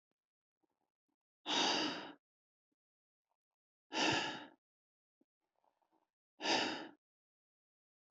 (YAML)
exhalation_length: 8.1 s
exhalation_amplitude: 2841
exhalation_signal_mean_std_ratio: 0.33
survey_phase: beta (2021-08-13 to 2022-03-07)
age: 45-64
gender: Male
wearing_mask: 'No'
symptom_none: true
smoker_status: Never smoked
respiratory_condition_asthma: false
respiratory_condition_other: false
recruitment_source: REACT
submission_delay: 2 days
covid_test_result: Negative
covid_test_method: RT-qPCR
influenza_a_test_result: Unknown/Void
influenza_b_test_result: Unknown/Void